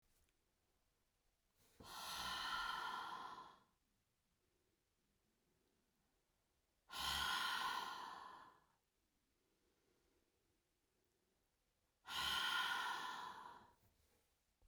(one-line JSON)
{"exhalation_length": "14.7 s", "exhalation_amplitude": 1050, "exhalation_signal_mean_std_ratio": 0.46, "survey_phase": "beta (2021-08-13 to 2022-03-07)", "age": "45-64", "gender": "Female", "wearing_mask": "No", "symptom_none": true, "smoker_status": "Never smoked", "respiratory_condition_asthma": false, "respiratory_condition_other": false, "recruitment_source": "REACT", "submission_delay": "2 days", "covid_test_result": "Negative", "covid_test_method": "RT-qPCR"}